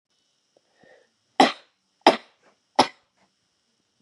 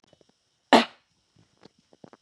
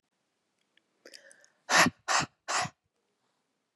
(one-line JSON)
{"three_cough_length": "4.0 s", "three_cough_amplitude": 32443, "three_cough_signal_mean_std_ratio": 0.19, "cough_length": "2.2 s", "cough_amplitude": 22277, "cough_signal_mean_std_ratio": 0.18, "exhalation_length": "3.8 s", "exhalation_amplitude": 11610, "exhalation_signal_mean_std_ratio": 0.29, "survey_phase": "beta (2021-08-13 to 2022-03-07)", "age": "18-44", "gender": "Female", "wearing_mask": "No", "symptom_none": true, "smoker_status": "Never smoked", "respiratory_condition_asthma": true, "respiratory_condition_other": false, "recruitment_source": "REACT", "submission_delay": "1 day", "covid_test_result": "Negative", "covid_test_method": "RT-qPCR", "influenza_a_test_result": "Negative", "influenza_b_test_result": "Negative"}